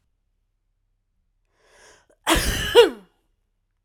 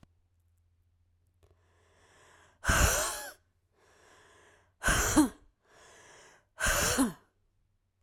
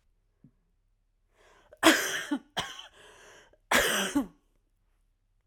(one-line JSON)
{"cough_length": "3.8 s", "cough_amplitude": 31277, "cough_signal_mean_std_ratio": 0.27, "exhalation_length": "8.0 s", "exhalation_amplitude": 10014, "exhalation_signal_mean_std_ratio": 0.36, "three_cough_length": "5.5 s", "three_cough_amplitude": 21538, "three_cough_signal_mean_std_ratio": 0.34, "survey_phase": "alpha (2021-03-01 to 2021-08-12)", "age": "18-44", "gender": "Female", "wearing_mask": "No", "symptom_cough_any": true, "symptom_shortness_of_breath": true, "symptom_fatigue": true, "symptom_headache": true, "smoker_status": "Ex-smoker", "respiratory_condition_asthma": false, "respiratory_condition_other": false, "recruitment_source": "Test and Trace", "submission_delay": "2 days", "covid_test_result": "Positive", "covid_test_method": "RT-qPCR", "covid_ct_value": 19.2, "covid_ct_gene": "ORF1ab gene", "covid_ct_mean": 20.2, "covid_viral_load": "240000 copies/ml", "covid_viral_load_category": "Low viral load (10K-1M copies/ml)"}